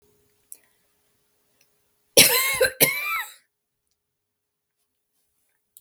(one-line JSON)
{"cough_length": "5.8 s", "cough_amplitude": 32768, "cough_signal_mean_std_ratio": 0.28, "survey_phase": "beta (2021-08-13 to 2022-03-07)", "age": "65+", "gender": "Female", "wearing_mask": "No", "symptom_none": true, "smoker_status": "Prefer not to say", "respiratory_condition_asthma": false, "respiratory_condition_other": false, "recruitment_source": "REACT", "submission_delay": "1 day", "covid_test_result": "Negative", "covid_test_method": "RT-qPCR"}